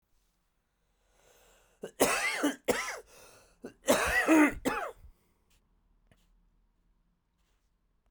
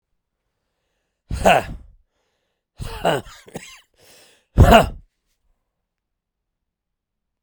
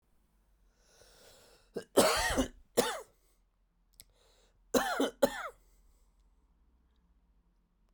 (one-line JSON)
{"cough_length": "8.1 s", "cough_amplitude": 9853, "cough_signal_mean_std_ratio": 0.36, "exhalation_length": "7.4 s", "exhalation_amplitude": 32767, "exhalation_signal_mean_std_ratio": 0.25, "three_cough_length": "7.9 s", "three_cough_amplitude": 10151, "three_cough_signal_mean_std_ratio": 0.31, "survey_phase": "beta (2021-08-13 to 2022-03-07)", "age": "45-64", "gender": "Male", "wearing_mask": "No", "symptom_cough_any": true, "symptom_new_continuous_cough": true, "symptom_runny_or_blocked_nose": true, "symptom_shortness_of_breath": true, "symptom_sore_throat": true, "symptom_fatigue": true, "symptom_fever_high_temperature": true, "symptom_headache": true, "symptom_onset": "2 days", "smoker_status": "Ex-smoker", "respiratory_condition_asthma": true, "respiratory_condition_other": false, "recruitment_source": "Test and Trace", "submission_delay": "1 day", "covid_test_result": "Positive", "covid_test_method": "RT-qPCR", "covid_ct_value": 17.4, "covid_ct_gene": "N gene", "covid_ct_mean": 18.4, "covid_viral_load": "920000 copies/ml", "covid_viral_load_category": "Low viral load (10K-1M copies/ml)"}